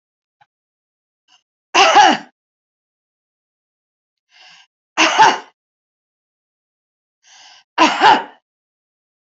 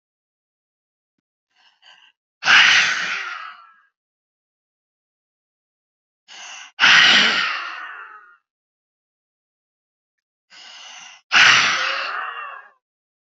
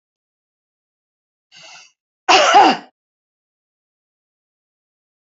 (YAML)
three_cough_length: 9.3 s
three_cough_amplitude: 30857
three_cough_signal_mean_std_ratio: 0.29
exhalation_length: 13.4 s
exhalation_amplitude: 31377
exhalation_signal_mean_std_ratio: 0.35
cough_length: 5.3 s
cough_amplitude: 30106
cough_signal_mean_std_ratio: 0.25
survey_phase: beta (2021-08-13 to 2022-03-07)
age: 45-64
gender: Female
wearing_mask: 'No'
symptom_none: true
smoker_status: Current smoker (e-cigarettes or vapes only)
respiratory_condition_asthma: true
respiratory_condition_other: false
recruitment_source: REACT
submission_delay: 4 days
covid_test_result: Negative
covid_test_method: RT-qPCR
influenza_a_test_result: Unknown/Void
influenza_b_test_result: Unknown/Void